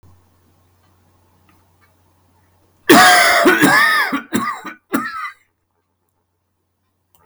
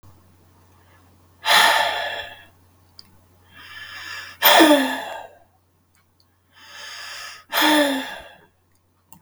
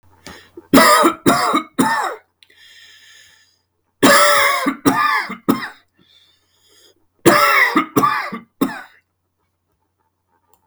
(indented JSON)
{
  "cough_length": "7.3 s",
  "cough_amplitude": 32768,
  "cough_signal_mean_std_ratio": 0.4,
  "exhalation_length": "9.2 s",
  "exhalation_amplitude": 32768,
  "exhalation_signal_mean_std_ratio": 0.39,
  "three_cough_length": "10.7 s",
  "three_cough_amplitude": 32768,
  "three_cough_signal_mean_std_ratio": 0.47,
  "survey_phase": "beta (2021-08-13 to 2022-03-07)",
  "age": "45-64",
  "gender": "Male",
  "wearing_mask": "No",
  "symptom_none": true,
  "smoker_status": "Never smoked",
  "respiratory_condition_asthma": false,
  "respiratory_condition_other": false,
  "recruitment_source": "REACT",
  "submission_delay": "1 day",
  "covid_test_result": "Negative",
  "covid_test_method": "RT-qPCR"
}